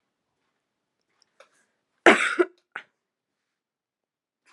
cough_length: 4.5 s
cough_amplitude: 32564
cough_signal_mean_std_ratio: 0.18
survey_phase: beta (2021-08-13 to 2022-03-07)
age: 18-44
gender: Female
wearing_mask: 'No'
symptom_runny_or_blocked_nose: true
symptom_change_to_sense_of_smell_or_taste: true
symptom_loss_of_taste: true
smoker_status: Never smoked
respiratory_condition_asthma: false
respiratory_condition_other: false
recruitment_source: Test and Trace
submission_delay: 4 days
covid_test_result: Positive
covid_test_method: LFT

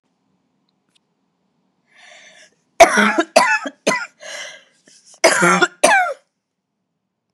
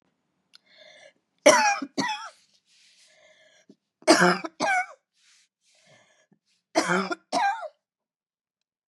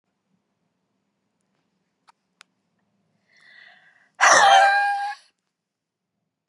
cough_length: 7.3 s
cough_amplitude: 32768
cough_signal_mean_std_ratio: 0.36
three_cough_length: 8.9 s
three_cough_amplitude: 26334
three_cough_signal_mean_std_ratio: 0.33
exhalation_length: 6.5 s
exhalation_amplitude: 26734
exhalation_signal_mean_std_ratio: 0.29
survey_phase: beta (2021-08-13 to 2022-03-07)
age: 45-64
gender: Female
wearing_mask: 'No'
symptom_cough_any: true
symptom_runny_or_blocked_nose: true
symptom_shortness_of_breath: true
symptom_sore_throat: true
symptom_fatigue: true
symptom_fever_high_temperature: true
symptom_headache: true
symptom_change_to_sense_of_smell_or_taste: true
symptom_loss_of_taste: true
symptom_other: true
symptom_onset: 8 days
smoker_status: Never smoked
respiratory_condition_asthma: false
respiratory_condition_other: false
recruitment_source: Test and Trace
submission_delay: 2 days
covid_test_result: Positive
covid_test_method: RT-qPCR
covid_ct_value: 27.6
covid_ct_gene: N gene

